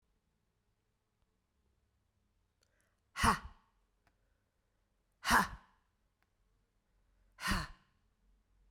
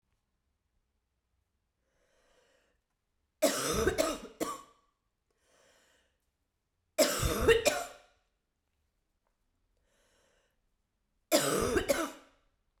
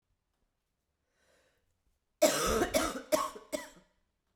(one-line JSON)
{"exhalation_length": "8.7 s", "exhalation_amplitude": 5800, "exhalation_signal_mean_std_ratio": 0.22, "three_cough_length": "12.8 s", "three_cough_amplitude": 10243, "three_cough_signal_mean_std_ratio": 0.33, "cough_length": "4.4 s", "cough_amplitude": 9227, "cough_signal_mean_std_ratio": 0.36, "survey_phase": "beta (2021-08-13 to 2022-03-07)", "age": "45-64", "gender": "Female", "wearing_mask": "No", "symptom_cough_any": true, "symptom_runny_or_blocked_nose": true, "symptom_change_to_sense_of_smell_or_taste": true, "symptom_loss_of_taste": true, "symptom_other": true, "smoker_status": "Never smoked", "respiratory_condition_asthma": false, "respiratory_condition_other": false, "recruitment_source": "Test and Trace", "submission_delay": "6 days", "covid_test_result": "Positive", "covid_test_method": "RT-qPCR"}